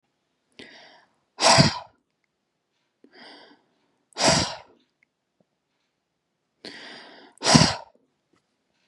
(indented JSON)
{
  "exhalation_length": "8.9 s",
  "exhalation_amplitude": 31876,
  "exhalation_signal_mean_std_ratio": 0.26,
  "survey_phase": "beta (2021-08-13 to 2022-03-07)",
  "age": "18-44",
  "gender": "Female",
  "wearing_mask": "No",
  "symptom_runny_or_blocked_nose": true,
  "symptom_shortness_of_breath": true,
  "symptom_headache": true,
  "symptom_loss_of_taste": true,
  "symptom_onset": "5 days",
  "smoker_status": "Never smoked",
  "respiratory_condition_asthma": false,
  "respiratory_condition_other": false,
  "recruitment_source": "Test and Trace",
  "submission_delay": "1 day",
  "covid_test_result": "Positive",
  "covid_test_method": "ePCR"
}